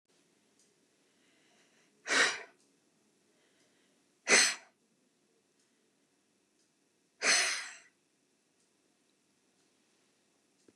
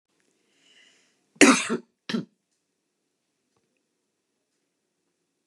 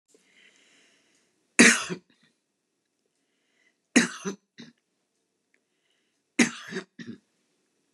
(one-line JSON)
{"exhalation_length": "10.8 s", "exhalation_amplitude": 9430, "exhalation_signal_mean_std_ratio": 0.24, "cough_length": "5.5 s", "cough_amplitude": 29718, "cough_signal_mean_std_ratio": 0.19, "three_cough_length": "7.9 s", "three_cough_amplitude": 25486, "three_cough_signal_mean_std_ratio": 0.21, "survey_phase": "beta (2021-08-13 to 2022-03-07)", "age": "65+", "gender": "Female", "wearing_mask": "No", "symptom_none": true, "smoker_status": "Ex-smoker", "respiratory_condition_asthma": false, "respiratory_condition_other": false, "recruitment_source": "REACT", "submission_delay": "2 days", "covid_test_result": "Negative", "covid_test_method": "RT-qPCR", "influenza_a_test_result": "Negative", "influenza_b_test_result": "Negative"}